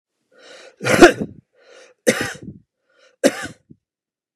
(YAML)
cough_length: 4.4 s
cough_amplitude: 32768
cough_signal_mean_std_ratio: 0.27
survey_phase: beta (2021-08-13 to 2022-03-07)
age: 45-64
gender: Male
wearing_mask: 'No'
symptom_runny_or_blocked_nose: true
smoker_status: Ex-smoker
respiratory_condition_asthma: false
respiratory_condition_other: false
recruitment_source: REACT
submission_delay: 2 days
covid_test_result: Negative
covid_test_method: RT-qPCR
influenza_a_test_result: Negative
influenza_b_test_result: Negative